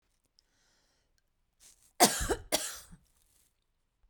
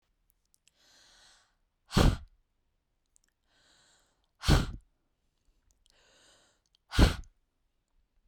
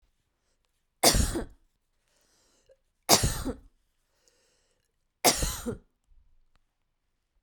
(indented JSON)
{
  "cough_length": "4.1 s",
  "cough_amplitude": 13954,
  "cough_signal_mean_std_ratio": 0.24,
  "exhalation_length": "8.3 s",
  "exhalation_amplitude": 12080,
  "exhalation_signal_mean_std_ratio": 0.21,
  "three_cough_length": "7.4 s",
  "three_cough_amplitude": 26320,
  "three_cough_signal_mean_std_ratio": 0.28,
  "survey_phase": "beta (2021-08-13 to 2022-03-07)",
  "age": "45-64",
  "gender": "Female",
  "wearing_mask": "No",
  "symptom_none": true,
  "smoker_status": "Ex-smoker",
  "respiratory_condition_asthma": false,
  "respiratory_condition_other": false,
  "recruitment_source": "REACT",
  "submission_delay": "7 days",
  "covid_test_result": "Negative",
  "covid_test_method": "RT-qPCR",
  "influenza_a_test_result": "Negative",
  "influenza_b_test_result": "Negative"
}